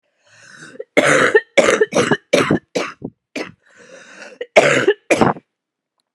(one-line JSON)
{"cough_length": "6.1 s", "cough_amplitude": 32768, "cough_signal_mean_std_ratio": 0.45, "survey_phase": "beta (2021-08-13 to 2022-03-07)", "age": "18-44", "gender": "Female", "wearing_mask": "No", "symptom_cough_any": true, "symptom_runny_or_blocked_nose": true, "symptom_shortness_of_breath": true, "symptom_sore_throat": true, "symptom_fatigue": true, "symptom_fever_high_temperature": true, "symptom_headache": true, "symptom_change_to_sense_of_smell_or_taste": true, "symptom_onset": "5 days", "smoker_status": "Never smoked", "respiratory_condition_asthma": false, "respiratory_condition_other": false, "recruitment_source": "Test and Trace", "submission_delay": "3 days", "covid_test_result": "Positive", "covid_test_method": "RT-qPCR", "covid_ct_value": 26.0, "covid_ct_gene": "ORF1ab gene", "covid_ct_mean": 26.8, "covid_viral_load": "1700 copies/ml", "covid_viral_load_category": "Minimal viral load (< 10K copies/ml)"}